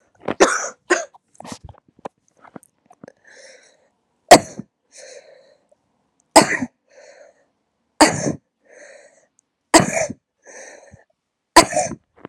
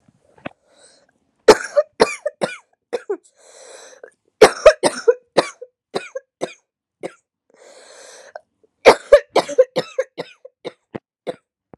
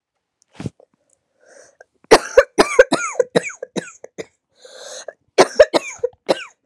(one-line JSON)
{"exhalation_length": "12.3 s", "exhalation_amplitude": 32768, "exhalation_signal_mean_std_ratio": 0.24, "three_cough_length": "11.8 s", "three_cough_amplitude": 32768, "three_cough_signal_mean_std_ratio": 0.25, "cough_length": "6.7 s", "cough_amplitude": 32768, "cough_signal_mean_std_ratio": 0.28, "survey_phase": "beta (2021-08-13 to 2022-03-07)", "age": "18-44", "gender": "Female", "wearing_mask": "No", "symptom_cough_any": true, "symptom_runny_or_blocked_nose": true, "symptom_shortness_of_breath": true, "symptom_sore_throat": true, "symptom_abdominal_pain": true, "symptom_diarrhoea": true, "symptom_fatigue": true, "symptom_fever_high_temperature": true, "symptom_headache": true, "symptom_change_to_sense_of_smell_or_taste": true, "symptom_onset": "3 days", "smoker_status": "Ex-smoker", "respiratory_condition_asthma": true, "respiratory_condition_other": false, "recruitment_source": "Test and Trace", "submission_delay": "2 days", "covid_test_result": "Positive", "covid_test_method": "RT-qPCR", "covid_ct_value": 22.4, "covid_ct_gene": "ORF1ab gene", "covid_ct_mean": 22.5, "covid_viral_load": "43000 copies/ml", "covid_viral_load_category": "Low viral load (10K-1M copies/ml)"}